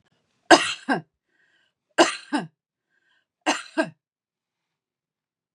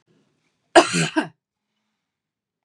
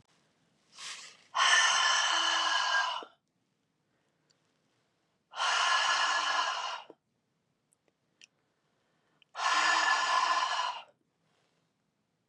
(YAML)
three_cough_length: 5.5 s
three_cough_amplitude: 32416
three_cough_signal_mean_std_ratio: 0.25
cough_length: 2.6 s
cough_amplitude: 32768
cough_signal_mean_std_ratio: 0.25
exhalation_length: 12.3 s
exhalation_amplitude: 8435
exhalation_signal_mean_std_ratio: 0.53
survey_phase: beta (2021-08-13 to 2022-03-07)
age: 65+
gender: Female
wearing_mask: 'No'
symptom_none: true
smoker_status: Never smoked
respiratory_condition_asthma: false
respiratory_condition_other: false
recruitment_source: REACT
submission_delay: 3 days
covid_test_result: Negative
covid_test_method: RT-qPCR
influenza_a_test_result: Negative
influenza_b_test_result: Negative